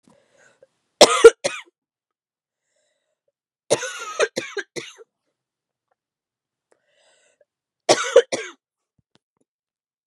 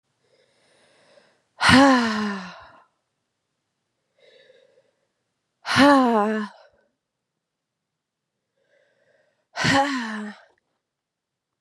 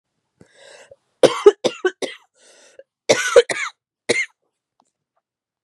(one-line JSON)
{"three_cough_length": "10.1 s", "three_cough_amplitude": 32768, "three_cough_signal_mean_std_ratio": 0.2, "exhalation_length": "11.6 s", "exhalation_amplitude": 30255, "exhalation_signal_mean_std_ratio": 0.33, "cough_length": "5.6 s", "cough_amplitude": 32768, "cough_signal_mean_std_ratio": 0.27, "survey_phase": "beta (2021-08-13 to 2022-03-07)", "age": "18-44", "gender": "Female", "wearing_mask": "No", "symptom_cough_any": true, "symptom_runny_or_blocked_nose": true, "symptom_sore_throat": true, "symptom_fatigue": true, "symptom_fever_high_temperature": true, "symptom_headache": true, "smoker_status": "Never smoked", "respiratory_condition_asthma": false, "respiratory_condition_other": false, "recruitment_source": "Test and Trace", "submission_delay": "2 days", "covid_test_result": "Positive", "covid_test_method": "LFT"}